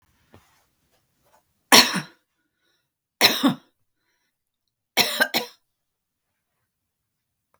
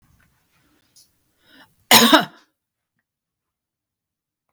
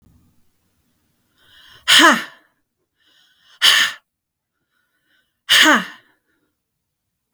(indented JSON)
{
  "three_cough_length": "7.6 s",
  "three_cough_amplitude": 32768,
  "three_cough_signal_mean_std_ratio": 0.24,
  "cough_length": "4.5 s",
  "cough_amplitude": 32768,
  "cough_signal_mean_std_ratio": 0.21,
  "exhalation_length": "7.3 s",
  "exhalation_amplitude": 32768,
  "exhalation_signal_mean_std_ratio": 0.29,
  "survey_phase": "beta (2021-08-13 to 2022-03-07)",
  "age": "65+",
  "gender": "Female",
  "wearing_mask": "No",
  "symptom_diarrhoea": true,
  "symptom_headache": true,
  "smoker_status": "Never smoked",
  "respiratory_condition_asthma": false,
  "respiratory_condition_other": false,
  "recruitment_source": "REACT",
  "submission_delay": "1 day",
  "covid_test_result": "Negative",
  "covid_test_method": "RT-qPCR",
  "influenza_a_test_result": "Negative",
  "influenza_b_test_result": "Negative"
}